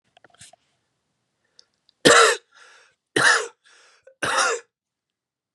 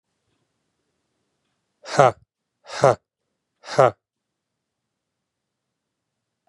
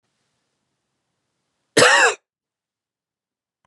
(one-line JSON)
{"three_cough_length": "5.5 s", "three_cough_amplitude": 31652, "three_cough_signal_mean_std_ratio": 0.31, "exhalation_length": "6.5 s", "exhalation_amplitude": 32082, "exhalation_signal_mean_std_ratio": 0.19, "cough_length": "3.7 s", "cough_amplitude": 31010, "cough_signal_mean_std_ratio": 0.25, "survey_phase": "beta (2021-08-13 to 2022-03-07)", "age": "18-44", "gender": "Male", "wearing_mask": "No", "symptom_runny_or_blocked_nose": true, "symptom_sore_throat": true, "symptom_fatigue": true, "symptom_headache": true, "smoker_status": "Ex-smoker", "respiratory_condition_asthma": false, "respiratory_condition_other": false, "recruitment_source": "Test and Trace", "submission_delay": "2 days", "covid_test_result": "Positive", "covid_test_method": "RT-qPCR", "covid_ct_value": 30.3, "covid_ct_gene": "N gene"}